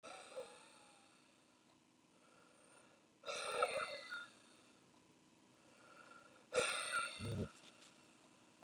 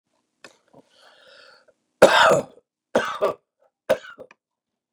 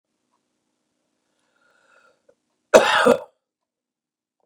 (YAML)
exhalation_length: 8.6 s
exhalation_amplitude: 2331
exhalation_signal_mean_std_ratio: 0.43
three_cough_length: 4.9 s
three_cough_amplitude: 32765
three_cough_signal_mean_std_ratio: 0.29
cough_length: 4.5 s
cough_amplitude: 32768
cough_signal_mean_std_ratio: 0.22
survey_phase: beta (2021-08-13 to 2022-03-07)
age: 65+
gender: Male
wearing_mask: 'No'
symptom_none: true
smoker_status: Ex-smoker
respiratory_condition_asthma: true
respiratory_condition_other: false
recruitment_source: REACT
submission_delay: 3 days
covid_test_result: Negative
covid_test_method: RT-qPCR
influenza_a_test_result: Negative
influenza_b_test_result: Negative